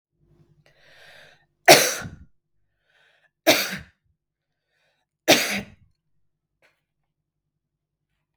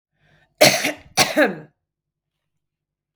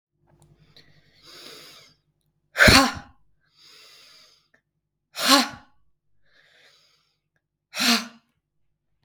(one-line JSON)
{"three_cough_length": "8.4 s", "three_cough_amplitude": 32768, "three_cough_signal_mean_std_ratio": 0.22, "cough_length": "3.2 s", "cough_amplitude": 32768, "cough_signal_mean_std_ratio": 0.32, "exhalation_length": "9.0 s", "exhalation_amplitude": 32768, "exhalation_signal_mean_std_ratio": 0.24, "survey_phase": "beta (2021-08-13 to 2022-03-07)", "age": "18-44", "gender": "Female", "wearing_mask": "No", "symptom_none": true, "smoker_status": "Ex-smoker", "respiratory_condition_asthma": false, "respiratory_condition_other": false, "recruitment_source": "REACT", "submission_delay": "2 days", "covid_test_result": "Negative", "covid_test_method": "RT-qPCR"}